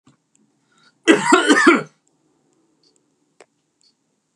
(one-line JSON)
{"cough_length": "4.4 s", "cough_amplitude": 32767, "cough_signal_mean_std_ratio": 0.31, "survey_phase": "beta (2021-08-13 to 2022-03-07)", "age": "18-44", "gender": "Male", "wearing_mask": "No", "symptom_runny_or_blocked_nose": true, "symptom_sore_throat": true, "symptom_onset": "4 days", "smoker_status": "Never smoked", "respiratory_condition_asthma": false, "respiratory_condition_other": false, "recruitment_source": "REACT", "submission_delay": "3 days", "covid_test_result": "Negative", "covid_test_method": "RT-qPCR", "influenza_a_test_result": "Negative", "influenza_b_test_result": "Negative"}